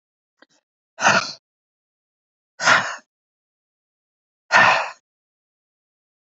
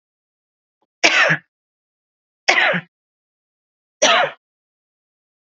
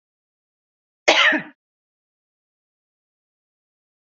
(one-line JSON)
{"exhalation_length": "6.3 s", "exhalation_amplitude": 28654, "exhalation_signal_mean_std_ratio": 0.28, "three_cough_length": "5.5 s", "three_cough_amplitude": 30205, "three_cough_signal_mean_std_ratio": 0.33, "cough_length": "4.0 s", "cough_amplitude": 27657, "cough_signal_mean_std_ratio": 0.22, "survey_phase": "beta (2021-08-13 to 2022-03-07)", "age": "45-64", "gender": "Female", "wearing_mask": "No", "symptom_none": true, "smoker_status": "Ex-smoker", "respiratory_condition_asthma": false, "respiratory_condition_other": false, "recruitment_source": "REACT", "submission_delay": "2 days", "covid_test_result": "Negative", "covid_test_method": "RT-qPCR", "influenza_a_test_result": "Negative", "influenza_b_test_result": "Negative"}